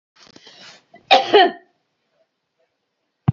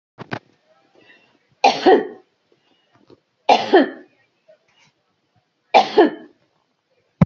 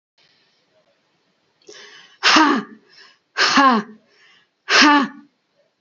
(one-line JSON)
{"cough_length": "3.3 s", "cough_amplitude": 29952, "cough_signal_mean_std_ratio": 0.27, "three_cough_length": "7.3 s", "three_cough_amplitude": 32680, "three_cough_signal_mean_std_ratio": 0.29, "exhalation_length": "5.8 s", "exhalation_amplitude": 32768, "exhalation_signal_mean_std_ratio": 0.38, "survey_phase": "beta (2021-08-13 to 2022-03-07)", "age": "45-64", "gender": "Female", "wearing_mask": "No", "symptom_none": true, "smoker_status": "Ex-smoker", "respiratory_condition_asthma": false, "respiratory_condition_other": false, "recruitment_source": "REACT", "submission_delay": "1 day", "covid_test_result": "Negative", "covid_test_method": "RT-qPCR"}